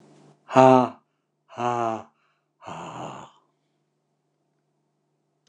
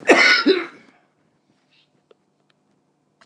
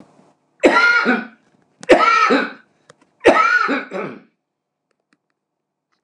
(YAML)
exhalation_length: 5.5 s
exhalation_amplitude: 29204
exhalation_signal_mean_std_ratio: 0.25
cough_length: 3.3 s
cough_amplitude: 29203
cough_signal_mean_std_ratio: 0.32
three_cough_length: 6.0 s
three_cough_amplitude: 29204
three_cough_signal_mean_std_ratio: 0.46
survey_phase: alpha (2021-03-01 to 2021-08-12)
age: 65+
gender: Male
wearing_mask: 'No'
symptom_none: true
smoker_status: Ex-smoker
respiratory_condition_asthma: false
respiratory_condition_other: false
recruitment_source: REACT
submission_delay: 2 days
covid_test_result: Negative
covid_test_method: RT-qPCR